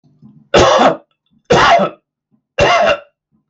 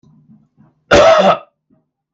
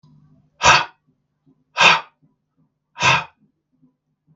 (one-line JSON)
{"three_cough_length": "3.5 s", "three_cough_amplitude": 32768, "three_cough_signal_mean_std_ratio": 0.54, "cough_length": "2.1 s", "cough_amplitude": 32768, "cough_signal_mean_std_ratio": 0.42, "exhalation_length": "4.4 s", "exhalation_amplitude": 32768, "exhalation_signal_mean_std_ratio": 0.3, "survey_phase": "beta (2021-08-13 to 2022-03-07)", "age": "18-44", "gender": "Male", "wearing_mask": "No", "symptom_none": true, "smoker_status": "Ex-smoker", "respiratory_condition_asthma": false, "respiratory_condition_other": false, "recruitment_source": "REACT", "submission_delay": "0 days", "covid_test_result": "Negative", "covid_test_method": "RT-qPCR"}